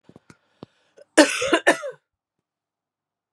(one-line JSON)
{"cough_length": "3.3 s", "cough_amplitude": 32763, "cough_signal_mean_std_ratio": 0.27, "survey_phase": "beta (2021-08-13 to 2022-03-07)", "age": "45-64", "gender": "Female", "wearing_mask": "No", "symptom_cough_any": true, "symptom_runny_or_blocked_nose": true, "symptom_loss_of_taste": true, "smoker_status": "Ex-smoker", "respiratory_condition_asthma": false, "respiratory_condition_other": false, "recruitment_source": "Test and Trace", "submission_delay": "1 day", "covid_test_result": "Positive", "covid_test_method": "RT-qPCR"}